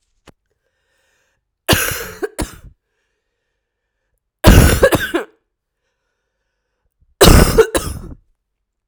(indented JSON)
{
  "three_cough_length": "8.9 s",
  "three_cough_amplitude": 32768,
  "three_cough_signal_mean_std_ratio": 0.32,
  "survey_phase": "alpha (2021-03-01 to 2021-08-12)",
  "age": "18-44",
  "gender": "Female",
  "wearing_mask": "No",
  "symptom_cough_any": true,
  "symptom_new_continuous_cough": true,
  "symptom_shortness_of_breath": true,
  "symptom_fatigue": true,
  "symptom_fever_high_temperature": true,
  "symptom_headache": true,
  "symptom_change_to_sense_of_smell_or_taste": true,
  "symptom_loss_of_taste": true,
  "symptom_onset": "4 days",
  "smoker_status": "Ex-smoker",
  "respiratory_condition_asthma": false,
  "respiratory_condition_other": false,
  "recruitment_source": "Test and Trace",
  "submission_delay": "2 days",
  "covid_test_result": "Positive",
  "covid_test_method": "RT-qPCR",
  "covid_ct_value": 15.4,
  "covid_ct_gene": "ORF1ab gene",
  "covid_ct_mean": 15.7,
  "covid_viral_load": "6900000 copies/ml",
  "covid_viral_load_category": "High viral load (>1M copies/ml)"
}